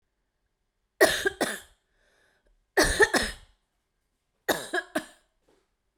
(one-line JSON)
{"three_cough_length": "6.0 s", "three_cough_amplitude": 15703, "three_cough_signal_mean_std_ratio": 0.32, "survey_phase": "beta (2021-08-13 to 2022-03-07)", "age": "18-44", "gender": "Female", "wearing_mask": "No", "symptom_fatigue": true, "symptom_headache": true, "symptom_change_to_sense_of_smell_or_taste": true, "symptom_loss_of_taste": true, "symptom_other": true, "symptom_onset": "8 days", "smoker_status": "Never smoked", "respiratory_condition_asthma": false, "respiratory_condition_other": false, "recruitment_source": "Test and Trace", "submission_delay": "1 day", "covid_test_result": "Positive", "covid_test_method": "RT-qPCR", "covid_ct_value": 23.5, "covid_ct_gene": "ORF1ab gene"}